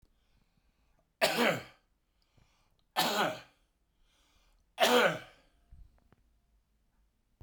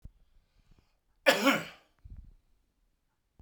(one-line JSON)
{"three_cough_length": "7.4 s", "three_cough_amplitude": 7846, "three_cough_signal_mean_std_ratio": 0.32, "cough_length": "3.4 s", "cough_amplitude": 13483, "cough_signal_mean_std_ratio": 0.26, "survey_phase": "beta (2021-08-13 to 2022-03-07)", "age": "65+", "gender": "Male", "wearing_mask": "No", "symptom_none": true, "smoker_status": "Ex-smoker", "respiratory_condition_asthma": false, "respiratory_condition_other": false, "recruitment_source": "REACT", "submission_delay": "2 days", "covid_test_result": "Negative", "covid_test_method": "RT-qPCR"}